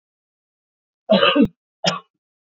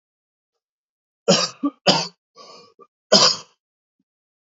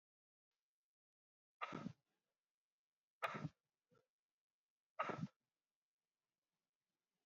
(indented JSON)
{
  "cough_length": "2.6 s",
  "cough_amplitude": 27120,
  "cough_signal_mean_std_ratio": 0.34,
  "three_cough_length": "4.5 s",
  "three_cough_amplitude": 31769,
  "three_cough_signal_mean_std_ratio": 0.3,
  "exhalation_length": "7.3 s",
  "exhalation_amplitude": 1182,
  "exhalation_signal_mean_std_ratio": 0.24,
  "survey_phase": "beta (2021-08-13 to 2022-03-07)",
  "age": "18-44",
  "gender": "Male",
  "wearing_mask": "No",
  "symptom_cough_any": true,
  "symptom_shortness_of_breath": true,
  "symptom_fatigue": true,
  "symptom_change_to_sense_of_smell_or_taste": true,
  "symptom_onset": "9 days",
  "smoker_status": "Ex-smoker",
  "respiratory_condition_asthma": false,
  "respiratory_condition_other": false,
  "recruitment_source": "Test and Trace",
  "submission_delay": "2 days",
  "covid_test_result": "Positive",
  "covid_test_method": "RT-qPCR",
  "covid_ct_value": 25.9,
  "covid_ct_gene": "ORF1ab gene"
}